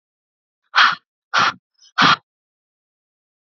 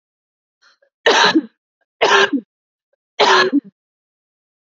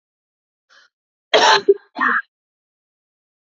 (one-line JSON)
{"exhalation_length": "3.4 s", "exhalation_amplitude": 28229, "exhalation_signal_mean_std_ratio": 0.32, "three_cough_length": "4.7 s", "three_cough_amplitude": 29924, "three_cough_signal_mean_std_ratio": 0.39, "cough_length": "3.4 s", "cough_amplitude": 28304, "cough_signal_mean_std_ratio": 0.31, "survey_phase": "beta (2021-08-13 to 2022-03-07)", "age": "18-44", "gender": "Female", "wearing_mask": "No", "symptom_runny_or_blocked_nose": true, "symptom_sore_throat": true, "symptom_fatigue": true, "symptom_headache": true, "smoker_status": "Never smoked", "respiratory_condition_asthma": false, "respiratory_condition_other": false, "recruitment_source": "Test and Trace", "submission_delay": "2 days", "covid_test_result": "Negative", "covid_test_method": "RT-qPCR"}